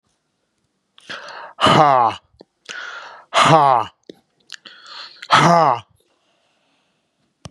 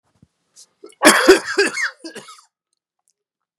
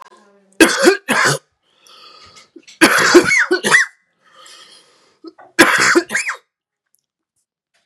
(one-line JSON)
{"exhalation_length": "7.5 s", "exhalation_amplitude": 32768, "exhalation_signal_mean_std_ratio": 0.38, "cough_length": "3.6 s", "cough_amplitude": 32768, "cough_signal_mean_std_ratio": 0.33, "three_cough_length": "7.9 s", "three_cough_amplitude": 32768, "three_cough_signal_mean_std_ratio": 0.42, "survey_phase": "beta (2021-08-13 to 2022-03-07)", "age": "45-64", "gender": "Male", "wearing_mask": "No", "symptom_cough_any": true, "symptom_runny_or_blocked_nose": true, "symptom_sore_throat": true, "symptom_abdominal_pain": true, "smoker_status": "Ex-smoker", "respiratory_condition_asthma": false, "respiratory_condition_other": false, "recruitment_source": "Test and Trace", "submission_delay": "1 day", "covid_test_result": "Positive", "covid_test_method": "RT-qPCR", "covid_ct_value": 28.9, "covid_ct_gene": "ORF1ab gene", "covid_ct_mean": 29.5, "covid_viral_load": "220 copies/ml", "covid_viral_load_category": "Minimal viral load (< 10K copies/ml)"}